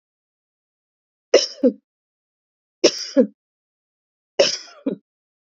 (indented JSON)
{
  "three_cough_length": "5.5 s",
  "three_cough_amplitude": 28268,
  "three_cough_signal_mean_std_ratio": 0.26,
  "survey_phase": "beta (2021-08-13 to 2022-03-07)",
  "age": "45-64",
  "gender": "Female",
  "wearing_mask": "No",
  "symptom_cough_any": true,
  "symptom_new_continuous_cough": true,
  "symptom_runny_or_blocked_nose": true,
  "symptom_fatigue": true,
  "symptom_onset": "4 days",
  "smoker_status": "Never smoked",
  "respiratory_condition_asthma": false,
  "respiratory_condition_other": false,
  "recruitment_source": "Test and Trace",
  "submission_delay": "2 days",
  "covid_test_result": "Positive",
  "covid_test_method": "RT-qPCR",
  "covid_ct_value": 13.5,
  "covid_ct_gene": "ORF1ab gene"
}